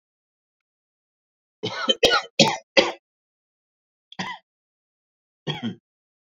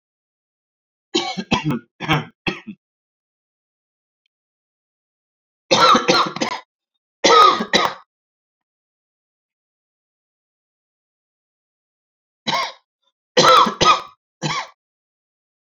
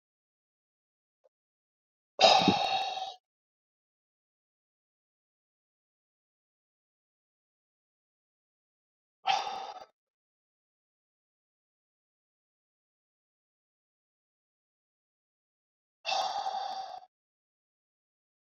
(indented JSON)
{
  "cough_length": "6.3 s",
  "cough_amplitude": 29570,
  "cough_signal_mean_std_ratio": 0.27,
  "three_cough_length": "15.7 s",
  "three_cough_amplitude": 32767,
  "three_cough_signal_mean_std_ratio": 0.32,
  "exhalation_length": "18.5 s",
  "exhalation_amplitude": 16086,
  "exhalation_signal_mean_std_ratio": 0.22,
  "survey_phase": "beta (2021-08-13 to 2022-03-07)",
  "age": "45-64",
  "gender": "Male",
  "wearing_mask": "No",
  "symptom_cough_any": true,
  "symptom_runny_or_blocked_nose": true,
  "symptom_fatigue": true,
  "smoker_status": "Never smoked",
  "respiratory_condition_asthma": true,
  "respiratory_condition_other": false,
  "recruitment_source": "Test and Trace",
  "submission_delay": "2 days",
  "covid_test_result": "Positive",
  "covid_test_method": "LFT"
}